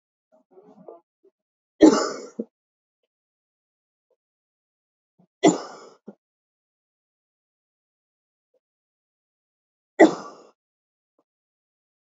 {"three_cough_length": "12.1 s", "three_cough_amplitude": 27538, "three_cough_signal_mean_std_ratio": 0.16, "survey_phase": "beta (2021-08-13 to 2022-03-07)", "age": "18-44", "gender": "Female", "wearing_mask": "No", "symptom_runny_or_blocked_nose": true, "symptom_fatigue": true, "symptom_other": true, "symptom_onset": "3 days", "smoker_status": "Never smoked", "respiratory_condition_asthma": false, "respiratory_condition_other": false, "recruitment_source": "Test and Trace", "submission_delay": "2 days", "covid_test_result": "Positive", "covid_test_method": "RT-qPCR", "covid_ct_value": 11.3, "covid_ct_gene": "ORF1ab gene"}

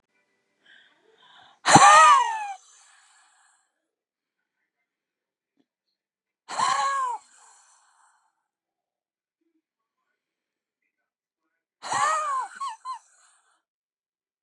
{"exhalation_length": "14.4 s", "exhalation_amplitude": 30806, "exhalation_signal_mean_std_ratio": 0.26, "survey_phase": "beta (2021-08-13 to 2022-03-07)", "age": "65+", "gender": "Female", "wearing_mask": "No", "symptom_none": true, "symptom_onset": "12 days", "smoker_status": "Ex-smoker", "respiratory_condition_asthma": false, "respiratory_condition_other": true, "recruitment_source": "REACT", "submission_delay": "1 day", "covid_test_result": "Negative", "covid_test_method": "RT-qPCR", "influenza_a_test_result": "Negative", "influenza_b_test_result": "Negative"}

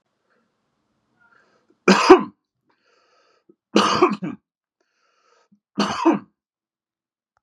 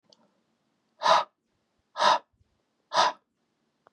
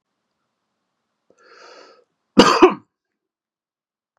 {"three_cough_length": "7.4 s", "three_cough_amplitude": 32768, "three_cough_signal_mean_std_ratio": 0.27, "exhalation_length": "3.9 s", "exhalation_amplitude": 13755, "exhalation_signal_mean_std_ratio": 0.3, "cough_length": "4.2 s", "cough_amplitude": 32768, "cough_signal_mean_std_ratio": 0.21, "survey_phase": "beta (2021-08-13 to 2022-03-07)", "age": "18-44", "gender": "Male", "wearing_mask": "No", "symptom_none": true, "smoker_status": "Never smoked", "respiratory_condition_asthma": false, "respiratory_condition_other": false, "recruitment_source": "REACT", "submission_delay": "2 days", "covid_test_result": "Positive", "covid_test_method": "RT-qPCR", "covid_ct_value": 29.4, "covid_ct_gene": "E gene", "influenza_a_test_result": "Negative", "influenza_b_test_result": "Negative"}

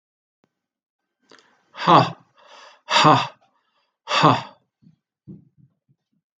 {"exhalation_length": "6.4 s", "exhalation_amplitude": 28177, "exhalation_signal_mean_std_ratio": 0.29, "survey_phase": "beta (2021-08-13 to 2022-03-07)", "age": "45-64", "gender": "Male", "wearing_mask": "No", "symptom_none": true, "smoker_status": "Ex-smoker", "respiratory_condition_asthma": false, "respiratory_condition_other": false, "recruitment_source": "REACT", "submission_delay": "2 days", "covid_test_result": "Negative", "covid_test_method": "RT-qPCR"}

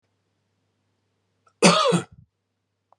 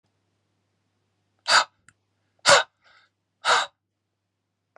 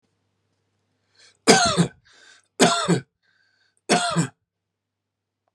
{"cough_length": "3.0 s", "cough_amplitude": 29152, "cough_signal_mean_std_ratio": 0.28, "exhalation_length": "4.8 s", "exhalation_amplitude": 27386, "exhalation_signal_mean_std_ratio": 0.25, "three_cough_length": "5.5 s", "three_cough_amplitude": 32541, "three_cough_signal_mean_std_ratio": 0.34, "survey_phase": "beta (2021-08-13 to 2022-03-07)", "age": "45-64", "gender": "Male", "wearing_mask": "No", "symptom_none": true, "smoker_status": "Never smoked", "respiratory_condition_asthma": false, "respiratory_condition_other": false, "recruitment_source": "Test and Trace", "submission_delay": "3 days", "covid_test_result": "Negative", "covid_test_method": "RT-qPCR"}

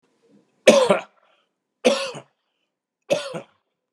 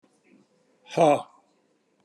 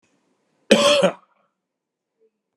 {"three_cough_length": "3.9 s", "three_cough_amplitude": 32768, "three_cough_signal_mean_std_ratio": 0.31, "exhalation_length": "2.0 s", "exhalation_amplitude": 15282, "exhalation_signal_mean_std_ratio": 0.27, "cough_length": "2.6 s", "cough_amplitude": 32768, "cough_signal_mean_std_ratio": 0.32, "survey_phase": "beta (2021-08-13 to 2022-03-07)", "age": "45-64", "gender": "Male", "wearing_mask": "No", "symptom_none": true, "smoker_status": "Never smoked", "respiratory_condition_asthma": false, "respiratory_condition_other": false, "recruitment_source": "REACT", "submission_delay": "1 day", "covid_test_result": "Negative", "covid_test_method": "RT-qPCR"}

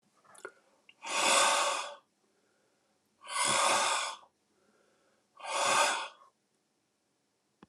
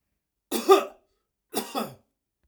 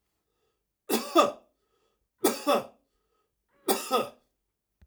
{"exhalation_length": "7.7 s", "exhalation_amplitude": 7500, "exhalation_signal_mean_std_ratio": 0.46, "cough_length": "2.5 s", "cough_amplitude": 21370, "cough_signal_mean_std_ratio": 0.29, "three_cough_length": "4.9 s", "three_cough_amplitude": 14410, "three_cough_signal_mean_std_ratio": 0.33, "survey_phase": "alpha (2021-03-01 to 2021-08-12)", "age": "45-64", "gender": "Male", "wearing_mask": "No", "symptom_none": true, "symptom_onset": "12 days", "smoker_status": "Ex-smoker", "respiratory_condition_asthma": false, "respiratory_condition_other": false, "recruitment_source": "REACT", "submission_delay": "1 day", "covid_test_result": "Negative", "covid_test_method": "RT-qPCR"}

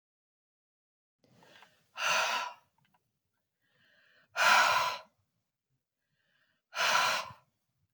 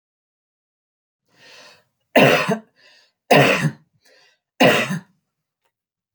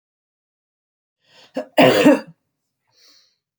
{"exhalation_length": "7.9 s", "exhalation_amplitude": 8353, "exhalation_signal_mean_std_ratio": 0.36, "three_cough_length": "6.1 s", "three_cough_amplitude": 29070, "three_cough_signal_mean_std_ratio": 0.34, "cough_length": "3.6 s", "cough_amplitude": 31856, "cough_signal_mean_std_ratio": 0.28, "survey_phase": "beta (2021-08-13 to 2022-03-07)", "age": "45-64", "gender": "Female", "wearing_mask": "No", "symptom_none": true, "smoker_status": "Ex-smoker", "respiratory_condition_asthma": false, "respiratory_condition_other": false, "recruitment_source": "REACT", "submission_delay": "2 days", "covid_test_result": "Negative", "covid_test_method": "RT-qPCR", "influenza_a_test_result": "Negative", "influenza_b_test_result": "Negative"}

